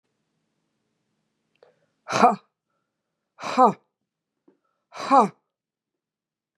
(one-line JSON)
{"exhalation_length": "6.6 s", "exhalation_amplitude": 23966, "exhalation_signal_mean_std_ratio": 0.23, "survey_phase": "beta (2021-08-13 to 2022-03-07)", "age": "65+", "gender": "Female", "wearing_mask": "No", "symptom_cough_any": true, "smoker_status": "Ex-smoker", "respiratory_condition_asthma": false, "respiratory_condition_other": false, "recruitment_source": "Test and Trace", "submission_delay": "1 day", "covid_test_result": "Negative", "covid_test_method": "RT-qPCR"}